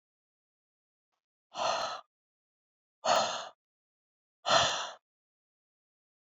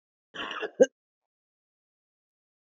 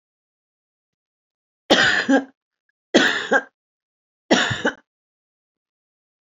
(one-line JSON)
{"exhalation_length": "6.4 s", "exhalation_amplitude": 7941, "exhalation_signal_mean_std_ratio": 0.32, "cough_length": "2.7 s", "cough_amplitude": 16430, "cough_signal_mean_std_ratio": 0.17, "three_cough_length": "6.2 s", "three_cough_amplitude": 28090, "three_cough_signal_mean_std_ratio": 0.34, "survey_phase": "beta (2021-08-13 to 2022-03-07)", "age": "65+", "gender": "Female", "wearing_mask": "No", "symptom_none": true, "smoker_status": "Ex-smoker", "respiratory_condition_asthma": false, "respiratory_condition_other": false, "recruitment_source": "REACT", "submission_delay": "2 days", "covid_test_result": "Negative", "covid_test_method": "RT-qPCR", "influenza_a_test_result": "Negative", "influenza_b_test_result": "Negative"}